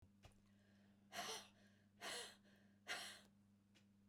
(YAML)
exhalation_length: 4.1 s
exhalation_amplitude: 567
exhalation_signal_mean_std_ratio: 0.52
survey_phase: beta (2021-08-13 to 2022-03-07)
age: 65+
gender: Female
wearing_mask: 'No'
symptom_none: true
smoker_status: Never smoked
respiratory_condition_asthma: false
respiratory_condition_other: false
recruitment_source: REACT
submission_delay: 2 days
covid_test_result: Negative
covid_test_method: RT-qPCR
influenza_a_test_result: Negative
influenza_b_test_result: Negative